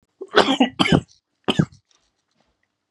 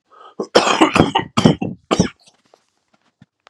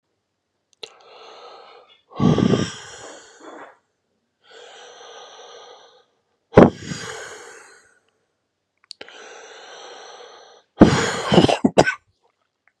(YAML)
three_cough_length: 2.9 s
three_cough_amplitude: 32767
three_cough_signal_mean_std_ratio: 0.34
cough_length: 3.5 s
cough_amplitude: 32768
cough_signal_mean_std_ratio: 0.4
exhalation_length: 12.8 s
exhalation_amplitude: 32768
exhalation_signal_mean_std_ratio: 0.27
survey_phase: beta (2021-08-13 to 2022-03-07)
age: 18-44
gender: Male
wearing_mask: 'No'
symptom_cough_any: true
symptom_runny_or_blocked_nose: true
symptom_sore_throat: true
symptom_fatigue: true
symptom_fever_high_temperature: true
symptom_headache: true
symptom_onset: 3 days
smoker_status: Never smoked
respiratory_condition_asthma: false
respiratory_condition_other: false
recruitment_source: Test and Trace
submission_delay: 2 days
covid_test_result: Positive
covid_test_method: RT-qPCR
covid_ct_value: 11.5
covid_ct_gene: ORF1ab gene
covid_ct_mean: 12.1
covid_viral_load: 100000000 copies/ml
covid_viral_load_category: High viral load (>1M copies/ml)